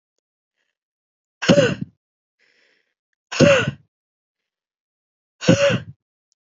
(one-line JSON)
{"exhalation_length": "6.6 s", "exhalation_amplitude": 28089, "exhalation_signal_mean_std_ratio": 0.3, "survey_phase": "beta (2021-08-13 to 2022-03-07)", "age": "18-44", "gender": "Female", "wearing_mask": "No", "symptom_runny_or_blocked_nose": true, "symptom_shortness_of_breath": true, "symptom_abdominal_pain": true, "symptom_headache": true, "symptom_change_to_sense_of_smell_or_taste": true, "symptom_loss_of_taste": true, "symptom_other": true, "smoker_status": "Ex-smoker", "respiratory_condition_asthma": false, "respiratory_condition_other": false, "recruitment_source": "Test and Trace", "submission_delay": "1 day", "covid_test_result": "Positive", "covid_test_method": "ePCR"}